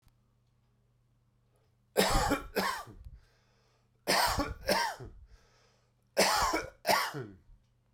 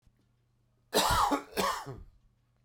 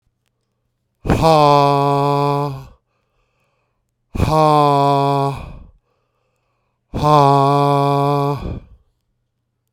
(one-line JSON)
{"three_cough_length": "7.9 s", "three_cough_amplitude": 9497, "three_cough_signal_mean_std_ratio": 0.45, "cough_length": "2.6 s", "cough_amplitude": 6901, "cough_signal_mean_std_ratio": 0.46, "exhalation_length": "9.7 s", "exhalation_amplitude": 32767, "exhalation_signal_mean_std_ratio": 0.56, "survey_phase": "alpha (2021-03-01 to 2021-08-12)", "age": "65+", "gender": "Male", "wearing_mask": "No", "symptom_cough_any": true, "symptom_change_to_sense_of_smell_or_taste": true, "symptom_loss_of_taste": true, "symptom_onset": "6 days", "smoker_status": "Ex-smoker", "respiratory_condition_asthma": false, "respiratory_condition_other": false, "recruitment_source": "Test and Trace", "submission_delay": "2 days", "covid_test_result": "Positive", "covid_test_method": "RT-qPCR", "covid_ct_value": 15.9, "covid_ct_gene": "ORF1ab gene", "covid_ct_mean": 16.2, "covid_viral_load": "5000000 copies/ml", "covid_viral_load_category": "High viral load (>1M copies/ml)"}